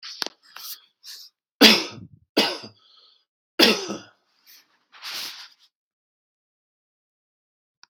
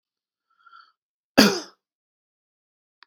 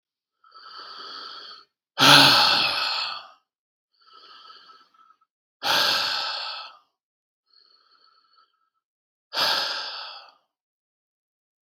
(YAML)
three_cough_length: 7.9 s
three_cough_amplitude: 32768
three_cough_signal_mean_std_ratio: 0.25
cough_length: 3.1 s
cough_amplitude: 32768
cough_signal_mean_std_ratio: 0.19
exhalation_length: 11.8 s
exhalation_amplitude: 32759
exhalation_signal_mean_std_ratio: 0.35
survey_phase: beta (2021-08-13 to 2022-03-07)
age: 45-64
gender: Male
wearing_mask: 'No'
symptom_none: true
smoker_status: Never smoked
respiratory_condition_asthma: false
respiratory_condition_other: false
recruitment_source: REACT
submission_delay: 2 days
covid_test_result: Negative
covid_test_method: RT-qPCR
influenza_a_test_result: Negative
influenza_b_test_result: Negative